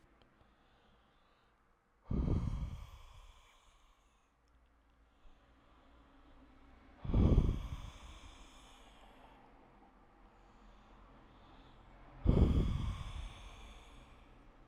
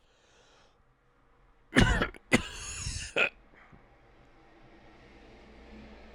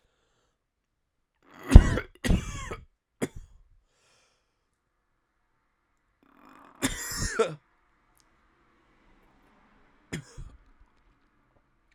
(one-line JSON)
{"exhalation_length": "14.7 s", "exhalation_amplitude": 6237, "exhalation_signal_mean_std_ratio": 0.35, "cough_length": "6.1 s", "cough_amplitude": 12406, "cough_signal_mean_std_ratio": 0.31, "three_cough_length": "11.9 s", "three_cough_amplitude": 32768, "three_cough_signal_mean_std_ratio": 0.17, "survey_phase": "alpha (2021-03-01 to 2021-08-12)", "age": "18-44", "gender": "Male", "wearing_mask": "No", "symptom_cough_any": true, "symptom_new_continuous_cough": true, "symptom_shortness_of_breath": true, "symptom_fatigue": true, "symptom_change_to_sense_of_smell_or_taste": true, "symptom_onset": "2 days", "smoker_status": "Never smoked", "respiratory_condition_asthma": true, "respiratory_condition_other": false, "recruitment_source": "Test and Trace", "submission_delay": "2 days", "covid_test_result": "Positive", "covid_test_method": "RT-qPCR", "covid_ct_value": 18.6, "covid_ct_gene": "ORF1ab gene", "covid_ct_mean": 19.3, "covid_viral_load": "470000 copies/ml", "covid_viral_load_category": "Low viral load (10K-1M copies/ml)"}